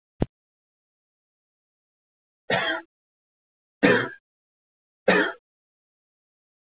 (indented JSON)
{
  "three_cough_length": "6.7 s",
  "three_cough_amplitude": 18779,
  "three_cough_signal_mean_std_ratio": 0.26,
  "survey_phase": "beta (2021-08-13 to 2022-03-07)",
  "age": "18-44",
  "gender": "Male",
  "wearing_mask": "No",
  "symptom_cough_any": true,
  "symptom_runny_or_blocked_nose": true,
  "smoker_status": "Never smoked",
  "respiratory_condition_asthma": false,
  "respiratory_condition_other": false,
  "recruitment_source": "Test and Trace",
  "submission_delay": "1 day",
  "covid_test_result": "Positive",
  "covid_test_method": "LFT"
}